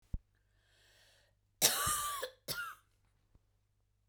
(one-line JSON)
{"cough_length": "4.1 s", "cough_amplitude": 7744, "cough_signal_mean_std_ratio": 0.35, "survey_phase": "beta (2021-08-13 to 2022-03-07)", "age": "45-64", "gender": "Female", "wearing_mask": "No", "symptom_none": true, "smoker_status": "Never smoked", "respiratory_condition_asthma": false, "respiratory_condition_other": false, "recruitment_source": "REACT", "submission_delay": "2 days", "covid_test_result": "Negative", "covid_test_method": "RT-qPCR", "influenza_a_test_result": "Negative", "influenza_b_test_result": "Negative"}